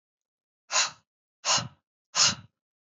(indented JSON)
{
  "exhalation_length": "3.0 s",
  "exhalation_amplitude": 13267,
  "exhalation_signal_mean_std_ratio": 0.34,
  "survey_phase": "beta (2021-08-13 to 2022-03-07)",
  "age": "18-44",
  "gender": "Male",
  "wearing_mask": "No",
  "symptom_cough_any": true,
  "symptom_headache": true,
  "smoker_status": "Never smoked",
  "respiratory_condition_asthma": false,
  "respiratory_condition_other": false,
  "recruitment_source": "Test and Trace",
  "submission_delay": "1 day",
  "covid_test_result": "Positive",
  "covid_test_method": "RT-qPCR",
  "covid_ct_value": 20.3,
  "covid_ct_gene": "ORF1ab gene",
  "covid_ct_mean": 20.8,
  "covid_viral_load": "150000 copies/ml",
  "covid_viral_load_category": "Low viral load (10K-1M copies/ml)"
}